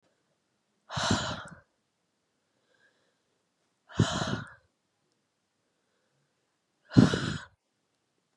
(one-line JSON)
{"exhalation_length": "8.4 s", "exhalation_amplitude": 22744, "exhalation_signal_mean_std_ratio": 0.25, "survey_phase": "beta (2021-08-13 to 2022-03-07)", "age": "18-44", "gender": "Female", "wearing_mask": "No", "symptom_cough_any": true, "symptom_runny_or_blocked_nose": true, "symptom_sore_throat": true, "symptom_diarrhoea": true, "symptom_fatigue": true, "symptom_other": true, "smoker_status": "Ex-smoker", "respiratory_condition_asthma": false, "respiratory_condition_other": false, "recruitment_source": "Test and Trace", "submission_delay": "1 day", "covid_test_result": "Positive", "covid_test_method": "RT-qPCR", "covid_ct_value": 23.3, "covid_ct_gene": "N gene"}